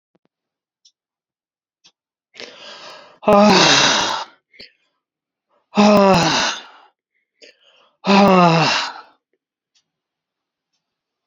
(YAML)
exhalation_length: 11.3 s
exhalation_amplitude: 32615
exhalation_signal_mean_std_ratio: 0.38
survey_phase: beta (2021-08-13 to 2022-03-07)
age: 65+
gender: Male
wearing_mask: 'No'
symptom_none: true
smoker_status: Ex-smoker
respiratory_condition_asthma: false
respiratory_condition_other: false
recruitment_source: REACT
submission_delay: 2 days
covid_test_result: Negative
covid_test_method: RT-qPCR